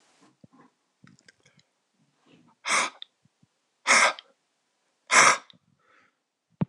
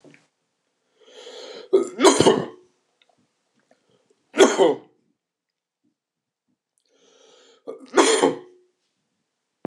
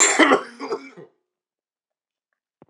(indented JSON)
{
  "exhalation_length": "6.7 s",
  "exhalation_amplitude": 24258,
  "exhalation_signal_mean_std_ratio": 0.26,
  "three_cough_length": "9.7 s",
  "three_cough_amplitude": 26028,
  "three_cough_signal_mean_std_ratio": 0.29,
  "cough_length": "2.7 s",
  "cough_amplitude": 26027,
  "cough_signal_mean_std_ratio": 0.34,
  "survey_phase": "beta (2021-08-13 to 2022-03-07)",
  "age": "45-64",
  "gender": "Male",
  "wearing_mask": "No",
  "symptom_cough_any": true,
  "smoker_status": "Never smoked",
  "respiratory_condition_asthma": false,
  "respiratory_condition_other": false,
  "recruitment_source": "Test and Trace",
  "submission_delay": "2 days",
  "covid_test_result": "Positive",
  "covid_test_method": "LAMP"
}